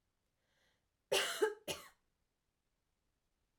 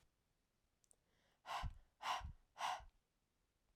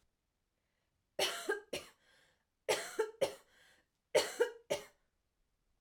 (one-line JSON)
{"cough_length": "3.6 s", "cough_amplitude": 3241, "cough_signal_mean_std_ratio": 0.28, "exhalation_length": "3.8 s", "exhalation_amplitude": 912, "exhalation_signal_mean_std_ratio": 0.39, "three_cough_length": "5.8 s", "three_cough_amplitude": 5192, "three_cough_signal_mean_std_ratio": 0.34, "survey_phase": "beta (2021-08-13 to 2022-03-07)", "age": "18-44", "gender": "Female", "wearing_mask": "No", "symptom_diarrhoea": true, "symptom_onset": "4 days", "smoker_status": "Never smoked", "respiratory_condition_asthma": false, "respiratory_condition_other": false, "recruitment_source": "Test and Trace", "submission_delay": "2 days", "covid_test_result": "Positive", "covid_test_method": "RT-qPCR"}